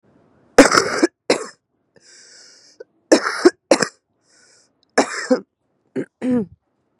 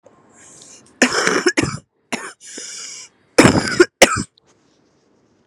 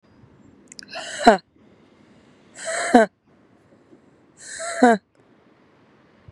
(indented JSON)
{
  "three_cough_length": "7.0 s",
  "three_cough_amplitude": 32768,
  "three_cough_signal_mean_std_ratio": 0.32,
  "cough_length": "5.5 s",
  "cough_amplitude": 32768,
  "cough_signal_mean_std_ratio": 0.36,
  "exhalation_length": "6.3 s",
  "exhalation_amplitude": 32767,
  "exhalation_signal_mean_std_ratio": 0.27,
  "survey_phase": "beta (2021-08-13 to 2022-03-07)",
  "age": "18-44",
  "gender": "Female",
  "wearing_mask": "No",
  "symptom_cough_any": true,
  "symptom_new_continuous_cough": true,
  "symptom_runny_or_blocked_nose": true,
  "symptom_fatigue": true,
  "symptom_onset": "10 days",
  "smoker_status": "Current smoker (1 to 10 cigarettes per day)",
  "respiratory_condition_asthma": false,
  "respiratory_condition_other": false,
  "recruitment_source": "REACT",
  "submission_delay": "1 day",
  "covid_test_result": "Negative",
  "covid_test_method": "RT-qPCR",
  "influenza_a_test_result": "Negative",
  "influenza_b_test_result": "Negative"
}